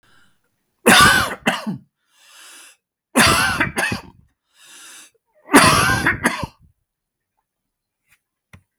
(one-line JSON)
{"three_cough_length": "8.8 s", "three_cough_amplitude": 32768, "three_cough_signal_mean_std_ratio": 0.39, "survey_phase": "beta (2021-08-13 to 2022-03-07)", "age": "45-64", "gender": "Male", "wearing_mask": "No", "symptom_sore_throat": true, "smoker_status": "Never smoked", "respiratory_condition_asthma": false, "respiratory_condition_other": false, "recruitment_source": "REACT", "submission_delay": "2 days", "covid_test_result": "Negative", "covid_test_method": "RT-qPCR", "influenza_a_test_result": "Negative", "influenza_b_test_result": "Negative"}